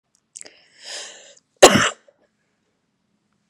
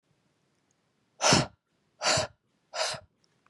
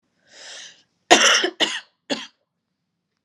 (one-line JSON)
{"cough_length": "3.5 s", "cough_amplitude": 32768, "cough_signal_mean_std_ratio": 0.21, "exhalation_length": "3.5 s", "exhalation_amplitude": 14571, "exhalation_signal_mean_std_ratio": 0.34, "three_cough_length": "3.2 s", "three_cough_amplitude": 32768, "three_cough_signal_mean_std_ratio": 0.33, "survey_phase": "beta (2021-08-13 to 2022-03-07)", "age": "18-44", "gender": "Female", "wearing_mask": "No", "symptom_cough_any": true, "symptom_runny_or_blocked_nose": true, "symptom_shortness_of_breath": true, "symptom_sore_throat": true, "symptom_abdominal_pain": true, "symptom_change_to_sense_of_smell_or_taste": true, "symptom_onset": "3 days", "smoker_status": "Never smoked", "respiratory_condition_asthma": false, "respiratory_condition_other": false, "recruitment_source": "Test and Trace", "submission_delay": "2 days", "covid_test_result": "Positive", "covid_test_method": "RT-qPCR", "covid_ct_value": 23.4, "covid_ct_gene": "ORF1ab gene"}